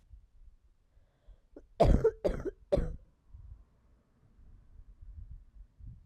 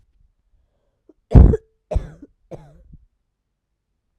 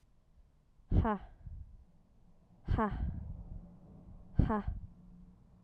{
  "cough_length": "6.1 s",
  "cough_amplitude": 8984,
  "cough_signal_mean_std_ratio": 0.31,
  "three_cough_length": "4.2 s",
  "three_cough_amplitude": 32768,
  "three_cough_signal_mean_std_ratio": 0.21,
  "exhalation_length": "5.6 s",
  "exhalation_amplitude": 7604,
  "exhalation_signal_mean_std_ratio": 0.43,
  "survey_phase": "alpha (2021-03-01 to 2021-08-12)",
  "age": "18-44",
  "gender": "Female",
  "wearing_mask": "No",
  "symptom_cough_any": true,
  "symptom_new_continuous_cough": true,
  "symptom_fatigue": true,
  "symptom_fever_high_temperature": true,
  "symptom_onset": "3 days",
  "smoker_status": "Ex-smoker",
  "respiratory_condition_asthma": false,
  "respiratory_condition_other": false,
  "recruitment_source": "Test and Trace",
  "submission_delay": "1 day",
  "covid_test_result": "Positive",
  "covid_test_method": "RT-qPCR",
  "covid_ct_value": 17.8,
  "covid_ct_gene": "N gene",
  "covid_ct_mean": 18.3,
  "covid_viral_load": "1000000 copies/ml",
  "covid_viral_load_category": "High viral load (>1M copies/ml)"
}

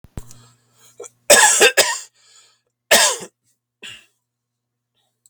{
  "cough_length": "5.3 s",
  "cough_amplitude": 32768,
  "cough_signal_mean_std_ratio": 0.33,
  "survey_phase": "beta (2021-08-13 to 2022-03-07)",
  "age": "45-64",
  "gender": "Male",
  "wearing_mask": "No",
  "symptom_none": true,
  "smoker_status": "Never smoked",
  "respiratory_condition_asthma": true,
  "respiratory_condition_other": false,
  "recruitment_source": "REACT",
  "submission_delay": "2 days",
  "covid_test_result": "Negative",
  "covid_test_method": "RT-qPCR",
  "covid_ct_value": 38.0,
  "covid_ct_gene": "N gene"
}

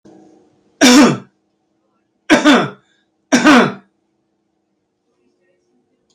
{
  "three_cough_length": "6.1 s",
  "three_cough_amplitude": 31480,
  "three_cough_signal_mean_std_ratio": 0.36,
  "survey_phase": "beta (2021-08-13 to 2022-03-07)",
  "age": "65+",
  "gender": "Male",
  "wearing_mask": "No",
  "symptom_cough_any": true,
  "smoker_status": "Ex-smoker",
  "respiratory_condition_asthma": false,
  "respiratory_condition_other": true,
  "recruitment_source": "REACT",
  "submission_delay": "5 days",
  "covid_test_result": "Negative",
  "covid_test_method": "RT-qPCR",
  "covid_ct_value": 37.0,
  "covid_ct_gene": "E gene"
}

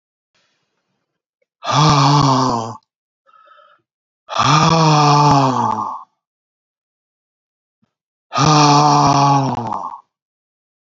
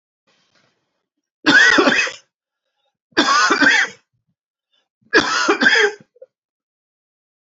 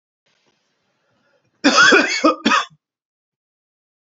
{
  "exhalation_length": "10.9 s",
  "exhalation_amplitude": 30949,
  "exhalation_signal_mean_std_ratio": 0.53,
  "three_cough_length": "7.5 s",
  "three_cough_amplitude": 29623,
  "three_cough_signal_mean_std_ratio": 0.43,
  "cough_length": "4.1 s",
  "cough_amplitude": 29940,
  "cough_signal_mean_std_ratio": 0.36,
  "survey_phase": "beta (2021-08-13 to 2022-03-07)",
  "age": "65+",
  "gender": "Male",
  "wearing_mask": "No",
  "symptom_cough_any": true,
  "symptom_sore_throat": true,
  "symptom_other": true,
  "smoker_status": "Never smoked",
  "respiratory_condition_asthma": false,
  "respiratory_condition_other": false,
  "recruitment_source": "Test and Trace",
  "submission_delay": "1 day",
  "covid_test_result": "Positive",
  "covid_test_method": "RT-qPCR",
  "covid_ct_value": 11.9,
  "covid_ct_gene": "ORF1ab gene"
}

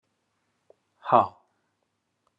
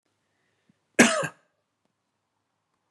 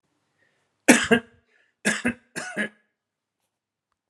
{
  "exhalation_length": "2.4 s",
  "exhalation_amplitude": 21186,
  "exhalation_signal_mean_std_ratio": 0.19,
  "cough_length": "2.9 s",
  "cough_amplitude": 28710,
  "cough_signal_mean_std_ratio": 0.21,
  "three_cough_length": "4.1 s",
  "three_cough_amplitude": 32628,
  "three_cough_signal_mean_std_ratio": 0.27,
  "survey_phase": "beta (2021-08-13 to 2022-03-07)",
  "age": "45-64",
  "gender": "Male",
  "wearing_mask": "No",
  "symptom_none": true,
  "smoker_status": "Never smoked",
  "respiratory_condition_asthma": false,
  "respiratory_condition_other": false,
  "recruitment_source": "REACT",
  "submission_delay": "1 day",
  "covid_test_result": "Negative",
  "covid_test_method": "RT-qPCR"
}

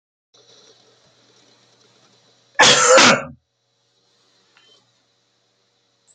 {
  "cough_length": "6.1 s",
  "cough_amplitude": 31057,
  "cough_signal_mean_std_ratio": 0.27,
  "survey_phase": "beta (2021-08-13 to 2022-03-07)",
  "age": "65+",
  "gender": "Male",
  "wearing_mask": "No",
  "symptom_none": true,
  "smoker_status": "Ex-smoker",
  "respiratory_condition_asthma": false,
  "respiratory_condition_other": false,
  "recruitment_source": "REACT",
  "submission_delay": "2 days",
  "covid_test_result": "Negative",
  "covid_test_method": "RT-qPCR",
  "influenza_a_test_result": "Negative",
  "influenza_b_test_result": "Negative"
}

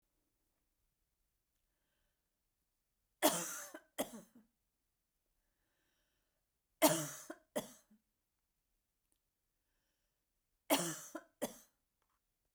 {
  "three_cough_length": "12.5 s",
  "three_cough_amplitude": 5924,
  "three_cough_signal_mean_std_ratio": 0.22,
  "survey_phase": "beta (2021-08-13 to 2022-03-07)",
  "age": "65+",
  "gender": "Female",
  "wearing_mask": "No",
  "symptom_none": true,
  "smoker_status": "Ex-smoker",
  "respiratory_condition_asthma": false,
  "respiratory_condition_other": false,
  "recruitment_source": "REACT",
  "submission_delay": "2 days",
  "covid_test_result": "Negative",
  "covid_test_method": "RT-qPCR"
}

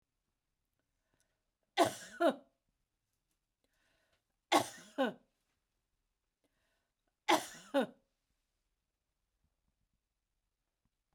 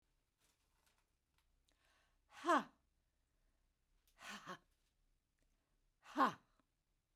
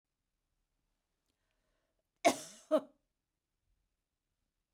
{
  "three_cough_length": "11.1 s",
  "three_cough_amplitude": 6615,
  "three_cough_signal_mean_std_ratio": 0.21,
  "exhalation_length": "7.2 s",
  "exhalation_amplitude": 2604,
  "exhalation_signal_mean_std_ratio": 0.21,
  "cough_length": "4.7 s",
  "cough_amplitude": 8177,
  "cough_signal_mean_std_ratio": 0.16,
  "survey_phase": "beta (2021-08-13 to 2022-03-07)",
  "age": "65+",
  "gender": "Female",
  "wearing_mask": "No",
  "symptom_fatigue": true,
  "smoker_status": "Never smoked",
  "respiratory_condition_asthma": false,
  "respiratory_condition_other": false,
  "recruitment_source": "REACT",
  "submission_delay": "2 days",
  "covid_test_result": "Negative",
  "covid_test_method": "RT-qPCR"
}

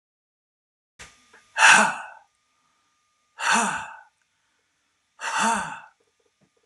{
  "exhalation_length": "6.7 s",
  "exhalation_amplitude": 28283,
  "exhalation_signal_mean_std_ratio": 0.32,
  "survey_phase": "beta (2021-08-13 to 2022-03-07)",
  "age": "18-44",
  "gender": "Male",
  "wearing_mask": "No",
  "symptom_none": true,
  "smoker_status": "Current smoker (1 to 10 cigarettes per day)",
  "respiratory_condition_asthma": false,
  "respiratory_condition_other": false,
  "recruitment_source": "REACT",
  "submission_delay": "1 day",
  "covid_test_result": "Negative",
  "covid_test_method": "RT-qPCR"
}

